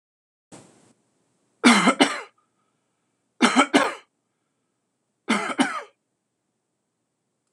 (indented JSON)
{
  "three_cough_length": "7.5 s",
  "three_cough_amplitude": 26028,
  "three_cough_signal_mean_std_ratio": 0.3,
  "survey_phase": "beta (2021-08-13 to 2022-03-07)",
  "age": "45-64",
  "gender": "Male",
  "wearing_mask": "No",
  "symptom_new_continuous_cough": true,
  "symptom_runny_or_blocked_nose": true,
  "symptom_onset": "6 days",
  "smoker_status": "Never smoked",
  "respiratory_condition_asthma": true,
  "respiratory_condition_other": false,
  "recruitment_source": "REACT",
  "submission_delay": "1 day",
  "covid_test_result": "Positive",
  "covid_test_method": "RT-qPCR",
  "covid_ct_value": 13.0,
  "covid_ct_gene": "N gene",
  "influenza_a_test_result": "Negative",
  "influenza_b_test_result": "Negative"
}